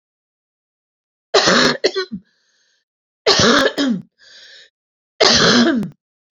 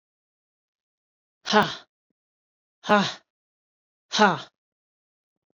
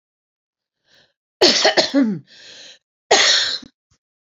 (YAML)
three_cough_length: 6.3 s
three_cough_amplitude: 32767
three_cough_signal_mean_std_ratio: 0.47
exhalation_length: 5.5 s
exhalation_amplitude: 22442
exhalation_signal_mean_std_ratio: 0.25
cough_length: 4.3 s
cough_amplitude: 30413
cough_signal_mean_std_ratio: 0.42
survey_phase: beta (2021-08-13 to 2022-03-07)
age: 45-64
gender: Female
wearing_mask: 'No'
symptom_cough_any: true
symptom_shortness_of_breath: true
symptom_fatigue: true
symptom_headache: true
symptom_change_to_sense_of_smell_or_taste: true
symptom_loss_of_taste: true
symptom_onset: 12 days
smoker_status: Never smoked
respiratory_condition_asthma: false
respiratory_condition_other: false
recruitment_source: REACT
submission_delay: 1 day
covid_test_result: Negative
covid_test_method: RT-qPCR